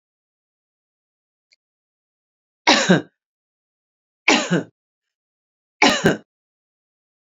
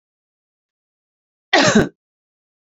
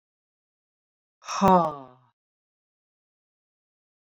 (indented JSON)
{
  "three_cough_length": "7.3 s",
  "three_cough_amplitude": 29085,
  "three_cough_signal_mean_std_ratio": 0.26,
  "cough_length": "2.7 s",
  "cough_amplitude": 32045,
  "cough_signal_mean_std_ratio": 0.27,
  "exhalation_length": "4.1 s",
  "exhalation_amplitude": 15644,
  "exhalation_signal_mean_std_ratio": 0.22,
  "survey_phase": "beta (2021-08-13 to 2022-03-07)",
  "age": "45-64",
  "gender": "Female",
  "wearing_mask": "No",
  "symptom_none": true,
  "smoker_status": "Never smoked",
  "respiratory_condition_asthma": false,
  "respiratory_condition_other": false,
  "recruitment_source": "REACT",
  "submission_delay": "3 days",
  "covid_test_result": "Negative",
  "covid_test_method": "RT-qPCR"
}